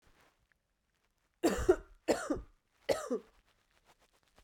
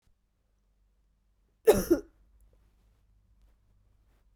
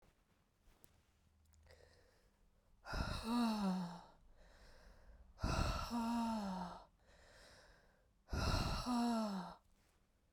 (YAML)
three_cough_length: 4.4 s
three_cough_amplitude: 6461
three_cough_signal_mean_std_ratio: 0.31
cough_length: 4.4 s
cough_amplitude: 13517
cough_signal_mean_std_ratio: 0.19
exhalation_length: 10.3 s
exhalation_amplitude: 1768
exhalation_signal_mean_std_ratio: 0.56
survey_phase: beta (2021-08-13 to 2022-03-07)
age: 18-44
gender: Female
wearing_mask: 'No'
symptom_cough_any: true
symptom_runny_or_blocked_nose: true
symptom_fatigue: true
symptom_headache: true
symptom_onset: 4 days
smoker_status: Never smoked
respiratory_condition_asthma: false
respiratory_condition_other: false
recruitment_source: Test and Trace
submission_delay: 2 days
covid_test_result: Positive
covid_test_method: RT-qPCR
covid_ct_value: 16.3
covid_ct_gene: ORF1ab gene
covid_ct_mean: 16.8
covid_viral_load: 3200000 copies/ml
covid_viral_load_category: High viral load (>1M copies/ml)